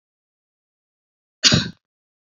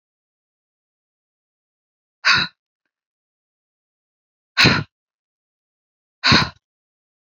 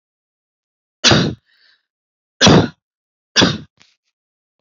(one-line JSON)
{"cough_length": "2.4 s", "cough_amplitude": 30400, "cough_signal_mean_std_ratio": 0.22, "exhalation_length": "7.3 s", "exhalation_amplitude": 29769, "exhalation_signal_mean_std_ratio": 0.24, "three_cough_length": "4.6 s", "three_cough_amplitude": 31641, "three_cough_signal_mean_std_ratio": 0.32, "survey_phase": "beta (2021-08-13 to 2022-03-07)", "age": "18-44", "gender": "Female", "wearing_mask": "No", "symptom_none": true, "smoker_status": "Never smoked", "respiratory_condition_asthma": true, "respiratory_condition_other": false, "recruitment_source": "REACT", "submission_delay": "1 day", "covid_test_result": "Negative", "covid_test_method": "RT-qPCR", "influenza_a_test_result": "Negative", "influenza_b_test_result": "Negative"}